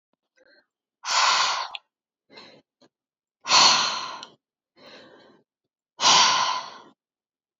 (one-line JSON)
{"exhalation_length": "7.6 s", "exhalation_amplitude": 21961, "exhalation_signal_mean_std_ratio": 0.39, "survey_phase": "beta (2021-08-13 to 2022-03-07)", "age": "18-44", "gender": "Female", "wearing_mask": "No", "symptom_runny_or_blocked_nose": true, "symptom_shortness_of_breath": true, "symptom_sore_throat": true, "symptom_diarrhoea": true, "symptom_fatigue": true, "symptom_headache": true, "symptom_onset": "4 days", "smoker_status": "Never smoked", "respiratory_condition_asthma": false, "respiratory_condition_other": false, "recruitment_source": "Test and Trace", "submission_delay": "1 day", "covid_test_result": "Positive", "covid_test_method": "RT-qPCR", "covid_ct_value": 19.8, "covid_ct_gene": "ORF1ab gene", "covid_ct_mean": 20.9, "covid_viral_load": "140000 copies/ml", "covid_viral_load_category": "Low viral load (10K-1M copies/ml)"}